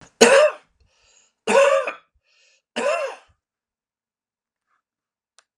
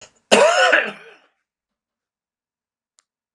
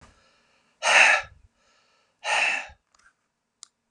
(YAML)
three_cough_length: 5.6 s
three_cough_amplitude: 32768
three_cough_signal_mean_std_ratio: 0.33
cough_length: 3.3 s
cough_amplitude: 32768
cough_signal_mean_std_ratio: 0.34
exhalation_length: 3.9 s
exhalation_amplitude: 24122
exhalation_signal_mean_std_ratio: 0.34
survey_phase: beta (2021-08-13 to 2022-03-07)
age: 65+
gender: Male
wearing_mask: 'No'
symptom_none: true
smoker_status: Never smoked
respiratory_condition_asthma: false
respiratory_condition_other: false
recruitment_source: REACT
submission_delay: 1 day
covid_test_result: Negative
covid_test_method: RT-qPCR